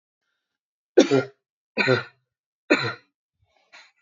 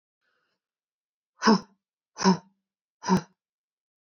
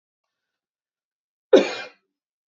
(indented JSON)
{
  "three_cough_length": "4.0 s",
  "three_cough_amplitude": 27129,
  "three_cough_signal_mean_std_ratio": 0.29,
  "exhalation_length": "4.2 s",
  "exhalation_amplitude": 15735,
  "exhalation_signal_mean_std_ratio": 0.26,
  "cough_length": "2.5 s",
  "cough_amplitude": 27561,
  "cough_signal_mean_std_ratio": 0.19,
  "survey_phase": "beta (2021-08-13 to 2022-03-07)",
  "age": "18-44",
  "gender": "Female",
  "wearing_mask": "No",
  "symptom_none": true,
  "smoker_status": "Never smoked",
  "respiratory_condition_asthma": true,
  "respiratory_condition_other": false,
  "recruitment_source": "REACT",
  "submission_delay": "2 days",
  "covid_test_result": "Negative",
  "covid_test_method": "RT-qPCR",
  "influenza_a_test_result": "Negative",
  "influenza_b_test_result": "Negative"
}